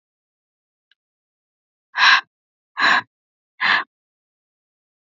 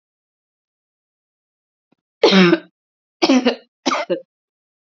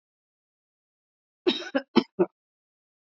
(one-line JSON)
{"exhalation_length": "5.1 s", "exhalation_amplitude": 31338, "exhalation_signal_mean_std_ratio": 0.28, "three_cough_length": "4.9 s", "three_cough_amplitude": 32767, "three_cough_signal_mean_std_ratio": 0.33, "cough_length": "3.1 s", "cough_amplitude": 18402, "cough_signal_mean_std_ratio": 0.23, "survey_phase": "beta (2021-08-13 to 2022-03-07)", "age": "18-44", "gender": "Female", "wearing_mask": "No", "symptom_none": true, "smoker_status": "Never smoked", "respiratory_condition_asthma": false, "respiratory_condition_other": false, "recruitment_source": "REACT", "submission_delay": "8 days", "covid_test_result": "Negative", "covid_test_method": "RT-qPCR", "influenza_a_test_result": "Negative", "influenza_b_test_result": "Negative"}